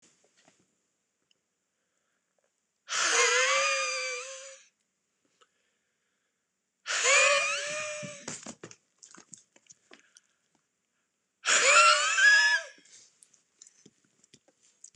{"exhalation_length": "15.0 s", "exhalation_amplitude": 13247, "exhalation_signal_mean_std_ratio": 0.39, "survey_phase": "beta (2021-08-13 to 2022-03-07)", "age": "45-64", "gender": "Male", "wearing_mask": "No", "symptom_cough_any": true, "symptom_new_continuous_cough": true, "symptom_fatigue": true, "symptom_change_to_sense_of_smell_or_taste": true, "symptom_onset": "5 days", "smoker_status": "Ex-smoker", "respiratory_condition_asthma": false, "respiratory_condition_other": false, "recruitment_source": "Test and Trace", "submission_delay": "1 day", "covid_test_result": "Positive", "covid_test_method": "RT-qPCR", "covid_ct_value": 15.3, "covid_ct_gene": "ORF1ab gene", "covid_ct_mean": 15.5, "covid_viral_load": "8200000 copies/ml", "covid_viral_load_category": "High viral load (>1M copies/ml)"}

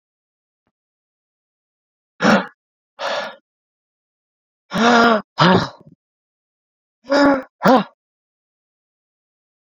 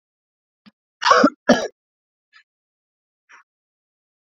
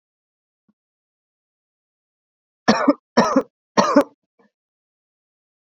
{"exhalation_length": "9.7 s", "exhalation_amplitude": 28742, "exhalation_signal_mean_std_ratio": 0.32, "cough_length": "4.4 s", "cough_amplitude": 32497, "cough_signal_mean_std_ratio": 0.23, "three_cough_length": "5.7 s", "three_cough_amplitude": 32767, "three_cough_signal_mean_std_ratio": 0.26, "survey_phase": "beta (2021-08-13 to 2022-03-07)", "age": "18-44", "gender": "Male", "wearing_mask": "No", "symptom_cough_any": true, "symptom_runny_or_blocked_nose": true, "symptom_sore_throat": true, "symptom_change_to_sense_of_smell_or_taste": true, "symptom_loss_of_taste": true, "symptom_onset": "4 days", "smoker_status": "Never smoked", "respiratory_condition_asthma": false, "respiratory_condition_other": false, "recruitment_source": "Test and Trace", "submission_delay": "2 days", "covid_test_result": "Positive", "covid_test_method": "ePCR"}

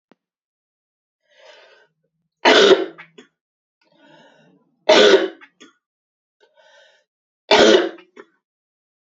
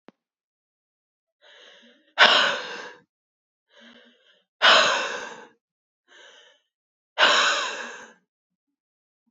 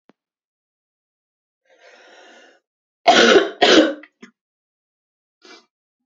{"three_cough_length": "9.0 s", "three_cough_amplitude": 31369, "three_cough_signal_mean_std_ratio": 0.29, "exhalation_length": "9.3 s", "exhalation_amplitude": 28777, "exhalation_signal_mean_std_ratio": 0.32, "cough_length": "6.1 s", "cough_amplitude": 30366, "cough_signal_mean_std_ratio": 0.28, "survey_phase": "beta (2021-08-13 to 2022-03-07)", "age": "18-44", "gender": "Female", "wearing_mask": "No", "symptom_cough_any": true, "symptom_runny_or_blocked_nose": true, "symptom_headache": true, "symptom_other": true, "symptom_onset": "2 days", "smoker_status": "Never smoked", "respiratory_condition_asthma": false, "respiratory_condition_other": false, "recruitment_source": "Test and Trace", "submission_delay": "1 day", "covid_test_result": "Positive", "covid_test_method": "ePCR"}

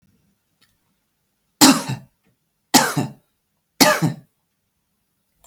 {"three_cough_length": "5.5 s", "three_cough_amplitude": 32768, "three_cough_signal_mean_std_ratio": 0.28, "survey_phase": "beta (2021-08-13 to 2022-03-07)", "age": "45-64", "gender": "Female", "wearing_mask": "No", "symptom_none": true, "smoker_status": "Never smoked", "respiratory_condition_asthma": false, "respiratory_condition_other": false, "recruitment_source": "Test and Trace", "submission_delay": "2 days", "covid_test_result": "Negative", "covid_test_method": "LFT"}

